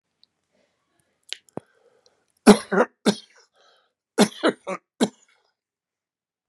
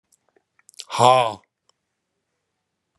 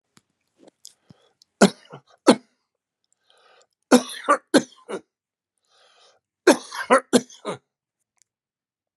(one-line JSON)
{"cough_length": "6.5 s", "cough_amplitude": 32768, "cough_signal_mean_std_ratio": 0.21, "exhalation_length": "3.0 s", "exhalation_amplitude": 29866, "exhalation_signal_mean_std_ratio": 0.25, "three_cough_length": "9.0 s", "three_cough_amplitude": 32095, "three_cough_signal_mean_std_ratio": 0.22, "survey_phase": "beta (2021-08-13 to 2022-03-07)", "age": "65+", "gender": "Male", "wearing_mask": "No", "symptom_new_continuous_cough": true, "symptom_runny_or_blocked_nose": true, "symptom_fatigue": true, "symptom_headache": true, "symptom_change_to_sense_of_smell_or_taste": true, "symptom_loss_of_taste": true, "symptom_onset": "4 days", "smoker_status": "Ex-smoker", "respiratory_condition_asthma": false, "respiratory_condition_other": false, "recruitment_source": "Test and Trace", "submission_delay": "2 days", "covid_test_result": "Positive", "covid_ct_value": 19.3, "covid_ct_gene": "S gene", "covid_ct_mean": 19.7, "covid_viral_load": "340000 copies/ml", "covid_viral_load_category": "Low viral load (10K-1M copies/ml)"}